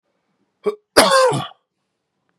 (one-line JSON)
{"cough_length": "2.4 s", "cough_amplitude": 32768, "cough_signal_mean_std_ratio": 0.38, "survey_phase": "beta (2021-08-13 to 2022-03-07)", "age": "18-44", "gender": "Male", "wearing_mask": "No", "symptom_cough_any": true, "symptom_runny_or_blocked_nose": true, "symptom_fatigue": true, "symptom_headache": true, "smoker_status": "Current smoker (e-cigarettes or vapes only)", "respiratory_condition_asthma": true, "respiratory_condition_other": false, "recruitment_source": "Test and Trace", "submission_delay": "1 day", "covid_test_result": "Positive", "covid_test_method": "LFT"}